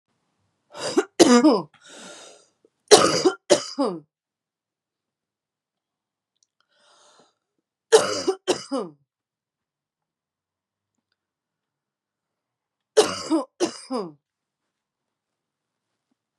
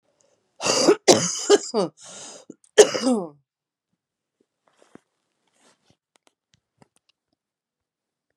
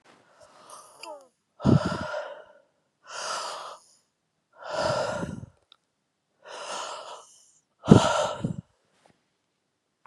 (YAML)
three_cough_length: 16.4 s
three_cough_amplitude: 32768
three_cough_signal_mean_std_ratio: 0.27
cough_length: 8.4 s
cough_amplitude: 32767
cough_signal_mean_std_ratio: 0.27
exhalation_length: 10.1 s
exhalation_amplitude: 32655
exhalation_signal_mean_std_ratio: 0.32
survey_phase: beta (2021-08-13 to 2022-03-07)
age: 18-44
gender: Female
wearing_mask: 'No'
symptom_runny_or_blocked_nose: true
symptom_sore_throat: true
symptom_onset: 4 days
smoker_status: Current smoker (11 or more cigarettes per day)
respiratory_condition_asthma: false
respiratory_condition_other: false
recruitment_source: Test and Trace
submission_delay: 3 days
covid_test_result: Positive
covid_test_method: RT-qPCR
covid_ct_value: 18.6
covid_ct_gene: ORF1ab gene
covid_ct_mean: 19.0
covid_viral_load: 610000 copies/ml
covid_viral_load_category: Low viral load (10K-1M copies/ml)